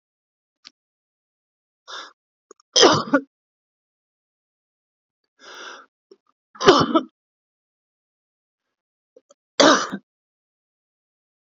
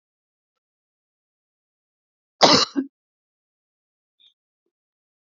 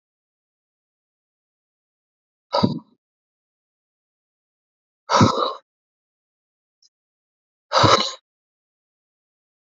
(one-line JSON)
{"three_cough_length": "11.4 s", "three_cough_amplitude": 30863, "three_cough_signal_mean_std_ratio": 0.23, "cough_length": "5.2 s", "cough_amplitude": 28443, "cough_signal_mean_std_ratio": 0.18, "exhalation_length": "9.6 s", "exhalation_amplitude": 27530, "exhalation_signal_mean_std_ratio": 0.23, "survey_phase": "beta (2021-08-13 to 2022-03-07)", "age": "45-64", "gender": "Male", "wearing_mask": "No", "symptom_cough_any": true, "symptom_runny_or_blocked_nose": true, "symptom_shortness_of_breath": true, "smoker_status": "Current smoker (11 or more cigarettes per day)", "respiratory_condition_asthma": false, "respiratory_condition_other": true, "recruitment_source": "REACT", "submission_delay": "2 days", "covid_test_result": "Negative", "covid_test_method": "RT-qPCR", "influenza_a_test_result": "Unknown/Void", "influenza_b_test_result": "Unknown/Void"}